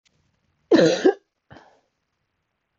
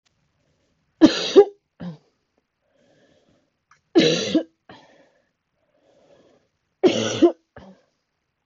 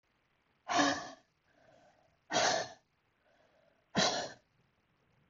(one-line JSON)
{"cough_length": "2.8 s", "cough_amplitude": 19055, "cough_signal_mean_std_ratio": 0.29, "three_cough_length": "8.5 s", "three_cough_amplitude": 28191, "three_cough_signal_mean_std_ratio": 0.27, "exhalation_length": "5.3 s", "exhalation_amplitude": 5036, "exhalation_signal_mean_std_ratio": 0.36, "survey_phase": "beta (2021-08-13 to 2022-03-07)", "age": "18-44", "gender": "Female", "wearing_mask": "No", "symptom_cough_any": true, "symptom_new_continuous_cough": true, "symptom_runny_or_blocked_nose": true, "symptom_shortness_of_breath": true, "symptom_onset": "4 days", "smoker_status": "Never smoked", "respiratory_condition_asthma": true, "respiratory_condition_other": false, "recruitment_source": "Test and Trace", "submission_delay": "1 day", "covid_test_result": "Negative", "covid_test_method": "RT-qPCR"}